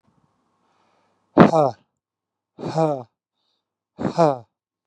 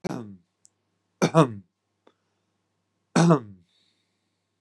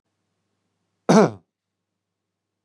{
  "exhalation_length": "4.9 s",
  "exhalation_amplitude": 32768,
  "exhalation_signal_mean_std_ratio": 0.29,
  "three_cough_length": "4.6 s",
  "three_cough_amplitude": 24199,
  "three_cough_signal_mean_std_ratio": 0.27,
  "cough_length": "2.6 s",
  "cough_amplitude": 28516,
  "cough_signal_mean_std_ratio": 0.21,
  "survey_phase": "beta (2021-08-13 to 2022-03-07)",
  "age": "18-44",
  "gender": "Male",
  "wearing_mask": "No",
  "symptom_none": true,
  "smoker_status": "Ex-smoker",
  "respiratory_condition_asthma": false,
  "respiratory_condition_other": false,
  "recruitment_source": "REACT",
  "submission_delay": "5 days",
  "covid_test_result": "Negative",
  "covid_test_method": "RT-qPCR",
  "influenza_a_test_result": "Negative",
  "influenza_b_test_result": "Negative"
}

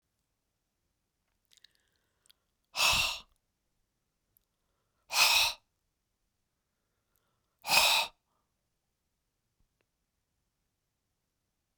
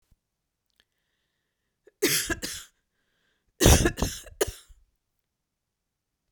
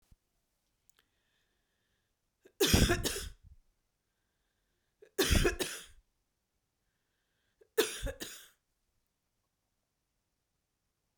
{
  "exhalation_length": "11.8 s",
  "exhalation_amplitude": 10764,
  "exhalation_signal_mean_std_ratio": 0.25,
  "cough_length": "6.3 s",
  "cough_amplitude": 22995,
  "cough_signal_mean_std_ratio": 0.27,
  "three_cough_length": "11.2 s",
  "three_cough_amplitude": 8922,
  "three_cough_signal_mean_std_ratio": 0.27,
  "survey_phase": "beta (2021-08-13 to 2022-03-07)",
  "age": "45-64",
  "gender": "Female",
  "wearing_mask": "No",
  "symptom_none": true,
  "smoker_status": "Never smoked",
  "respiratory_condition_asthma": false,
  "respiratory_condition_other": false,
  "recruitment_source": "REACT",
  "submission_delay": "1 day",
  "covid_test_result": "Negative",
  "covid_test_method": "RT-qPCR"
}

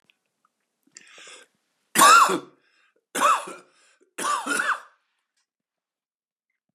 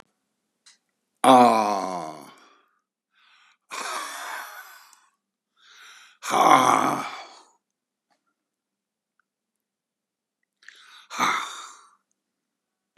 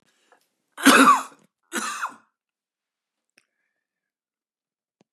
{
  "three_cough_length": "6.7 s",
  "three_cough_amplitude": 23924,
  "three_cough_signal_mean_std_ratio": 0.31,
  "exhalation_length": "13.0 s",
  "exhalation_amplitude": 28349,
  "exhalation_signal_mean_std_ratio": 0.3,
  "cough_length": "5.1 s",
  "cough_amplitude": 31610,
  "cough_signal_mean_std_ratio": 0.25,
  "survey_phase": "beta (2021-08-13 to 2022-03-07)",
  "age": "65+",
  "gender": "Male",
  "wearing_mask": "No",
  "symptom_cough_any": true,
  "symptom_runny_or_blocked_nose": true,
  "symptom_headache": true,
  "symptom_onset": "3 days",
  "smoker_status": "Ex-smoker",
  "respiratory_condition_asthma": true,
  "respiratory_condition_other": false,
  "recruitment_source": "Test and Trace",
  "submission_delay": "3 days",
  "covid_test_result": "Positive",
  "covid_test_method": "RT-qPCR",
  "covid_ct_value": 23.5,
  "covid_ct_gene": "N gene"
}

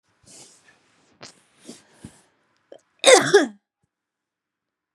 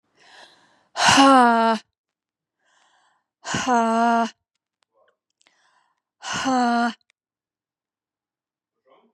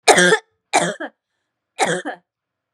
{
  "cough_length": "4.9 s",
  "cough_amplitude": 32709,
  "cough_signal_mean_std_ratio": 0.21,
  "exhalation_length": "9.1 s",
  "exhalation_amplitude": 26890,
  "exhalation_signal_mean_std_ratio": 0.39,
  "three_cough_length": "2.7 s",
  "three_cough_amplitude": 32768,
  "three_cough_signal_mean_std_ratio": 0.4,
  "survey_phase": "beta (2021-08-13 to 2022-03-07)",
  "age": "18-44",
  "gender": "Female",
  "wearing_mask": "No",
  "symptom_cough_any": true,
  "symptom_abdominal_pain": true,
  "symptom_fatigue": true,
  "symptom_headache": true,
  "symptom_onset": "3 days",
  "smoker_status": "Ex-smoker",
  "respiratory_condition_asthma": true,
  "respiratory_condition_other": false,
  "recruitment_source": "Test and Trace",
  "submission_delay": "2 days",
  "covid_test_result": "Positive",
  "covid_test_method": "ePCR"
}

